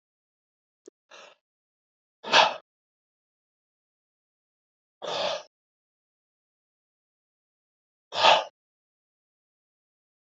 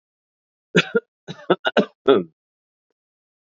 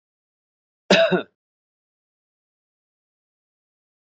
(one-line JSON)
{"exhalation_length": "10.3 s", "exhalation_amplitude": 21189, "exhalation_signal_mean_std_ratio": 0.2, "three_cough_length": "3.6 s", "three_cough_amplitude": 26408, "three_cough_signal_mean_std_ratio": 0.28, "cough_length": "4.1 s", "cough_amplitude": 26677, "cough_signal_mean_std_ratio": 0.21, "survey_phase": "beta (2021-08-13 to 2022-03-07)", "age": "45-64", "gender": "Male", "wearing_mask": "Yes", "symptom_none": true, "symptom_onset": "5 days", "smoker_status": "Ex-smoker", "respiratory_condition_asthma": false, "respiratory_condition_other": false, "recruitment_source": "REACT", "submission_delay": "4 days", "covid_test_result": "Negative", "covid_test_method": "RT-qPCR"}